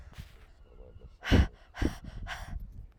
{
  "exhalation_length": "3.0 s",
  "exhalation_amplitude": 9429,
  "exhalation_signal_mean_std_ratio": 0.39,
  "survey_phase": "alpha (2021-03-01 to 2021-08-12)",
  "age": "18-44",
  "gender": "Female",
  "wearing_mask": "No",
  "symptom_cough_any": true,
  "symptom_abdominal_pain": true,
  "symptom_fatigue": true,
  "symptom_fever_high_temperature": true,
  "symptom_headache": true,
  "symptom_onset": "4 days",
  "smoker_status": "Ex-smoker",
  "respiratory_condition_asthma": false,
  "respiratory_condition_other": false,
  "recruitment_source": "Test and Trace",
  "submission_delay": "2 days",
  "covid_test_result": "Positive",
  "covid_test_method": "RT-qPCR",
  "covid_ct_value": 23.8,
  "covid_ct_gene": "ORF1ab gene"
}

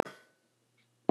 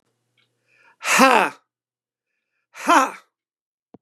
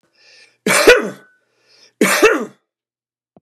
{
  "cough_length": "1.1 s",
  "cough_amplitude": 11714,
  "cough_signal_mean_std_ratio": 0.13,
  "exhalation_length": "4.0 s",
  "exhalation_amplitude": 32262,
  "exhalation_signal_mean_std_ratio": 0.3,
  "three_cough_length": "3.4 s",
  "three_cough_amplitude": 32768,
  "three_cough_signal_mean_std_ratio": 0.37,
  "survey_phase": "beta (2021-08-13 to 2022-03-07)",
  "age": "65+",
  "gender": "Male",
  "wearing_mask": "No",
  "symptom_none": true,
  "smoker_status": "Ex-smoker",
  "respiratory_condition_asthma": false,
  "respiratory_condition_other": false,
  "recruitment_source": "Test and Trace",
  "submission_delay": "0 days",
  "covid_test_result": "Negative",
  "covid_test_method": "LFT"
}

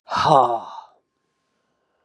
{
  "exhalation_length": "2.0 s",
  "exhalation_amplitude": 31052,
  "exhalation_signal_mean_std_ratio": 0.37,
  "survey_phase": "beta (2021-08-13 to 2022-03-07)",
  "age": "65+",
  "gender": "Female",
  "wearing_mask": "No",
  "symptom_cough_any": true,
  "symptom_runny_or_blocked_nose": true,
  "symptom_shortness_of_breath": true,
  "symptom_sore_throat": true,
  "symptom_diarrhoea": true,
  "symptom_fatigue": true,
  "symptom_headache": true,
  "symptom_other": true,
  "smoker_status": "Ex-smoker",
  "respiratory_condition_asthma": false,
  "respiratory_condition_other": false,
  "recruitment_source": "Test and Trace",
  "submission_delay": "1 day",
  "covid_test_result": "Positive",
  "covid_test_method": "LFT"
}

